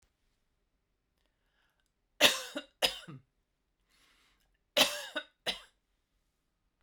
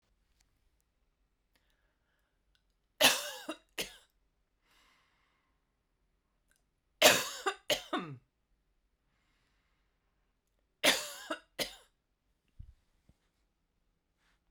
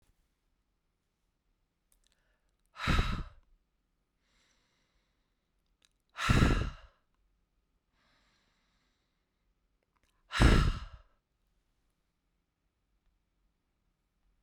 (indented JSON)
{
  "cough_length": "6.8 s",
  "cough_amplitude": 12926,
  "cough_signal_mean_std_ratio": 0.23,
  "three_cough_length": "14.5 s",
  "three_cough_amplitude": 12156,
  "three_cough_signal_mean_std_ratio": 0.21,
  "exhalation_length": "14.4 s",
  "exhalation_amplitude": 10899,
  "exhalation_signal_mean_std_ratio": 0.23,
  "survey_phase": "beta (2021-08-13 to 2022-03-07)",
  "age": "45-64",
  "gender": "Female",
  "wearing_mask": "No",
  "symptom_none": true,
  "smoker_status": "Never smoked",
  "respiratory_condition_asthma": false,
  "respiratory_condition_other": false,
  "recruitment_source": "REACT",
  "submission_delay": "1 day",
  "covid_test_result": "Negative",
  "covid_test_method": "RT-qPCR"
}